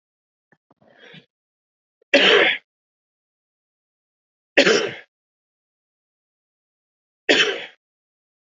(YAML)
three_cough_length: 8.5 s
three_cough_amplitude: 27901
three_cough_signal_mean_std_ratio: 0.27
survey_phase: beta (2021-08-13 to 2022-03-07)
age: 18-44
gender: Male
wearing_mask: 'No'
symptom_runny_or_blocked_nose: true
symptom_shortness_of_breath: true
smoker_status: Never smoked
respiratory_condition_asthma: false
respiratory_condition_other: false
recruitment_source: Test and Trace
submission_delay: 2 days
covid_test_result: Positive
covid_test_method: RT-qPCR
covid_ct_value: 19.0
covid_ct_gene: ORF1ab gene
covid_ct_mean: 19.3
covid_viral_load: 450000 copies/ml
covid_viral_load_category: Low viral load (10K-1M copies/ml)